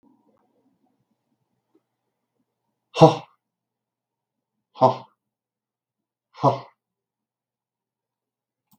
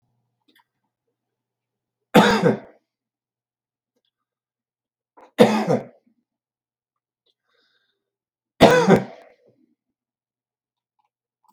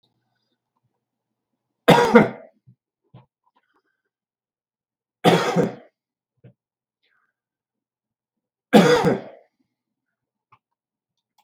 {"exhalation_length": "8.8 s", "exhalation_amplitude": 32768, "exhalation_signal_mean_std_ratio": 0.16, "three_cough_length": "11.5 s", "three_cough_amplitude": 32768, "three_cough_signal_mean_std_ratio": 0.24, "cough_length": "11.4 s", "cough_amplitude": 32768, "cough_signal_mean_std_ratio": 0.25, "survey_phase": "beta (2021-08-13 to 2022-03-07)", "age": "45-64", "gender": "Male", "wearing_mask": "No", "symptom_none": true, "smoker_status": "Current smoker (e-cigarettes or vapes only)", "respiratory_condition_asthma": false, "respiratory_condition_other": false, "recruitment_source": "REACT", "submission_delay": "0 days", "covid_test_result": "Negative", "covid_test_method": "RT-qPCR"}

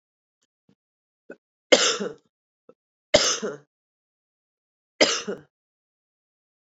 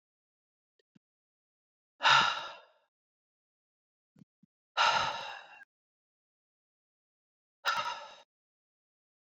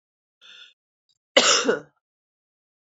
{"three_cough_length": "6.7 s", "three_cough_amplitude": 26890, "three_cough_signal_mean_std_ratio": 0.25, "exhalation_length": "9.4 s", "exhalation_amplitude": 8881, "exhalation_signal_mean_std_ratio": 0.27, "cough_length": "3.0 s", "cough_amplitude": 29359, "cough_signal_mean_std_ratio": 0.28, "survey_phase": "beta (2021-08-13 to 2022-03-07)", "age": "45-64", "gender": "Female", "wearing_mask": "No", "symptom_new_continuous_cough": true, "symptom_runny_or_blocked_nose": true, "symptom_sore_throat": true, "symptom_fatigue": true, "symptom_fever_high_temperature": true, "symptom_headache": true, "symptom_change_to_sense_of_smell_or_taste": true, "symptom_loss_of_taste": true, "symptom_onset": "3 days", "smoker_status": "Never smoked", "respiratory_condition_asthma": false, "respiratory_condition_other": false, "recruitment_source": "Test and Trace", "submission_delay": "1 day", "covid_test_result": "Positive", "covid_test_method": "RT-qPCR", "covid_ct_value": 20.6, "covid_ct_gene": "ORF1ab gene", "covid_ct_mean": 21.6, "covid_viral_load": "83000 copies/ml", "covid_viral_load_category": "Low viral load (10K-1M copies/ml)"}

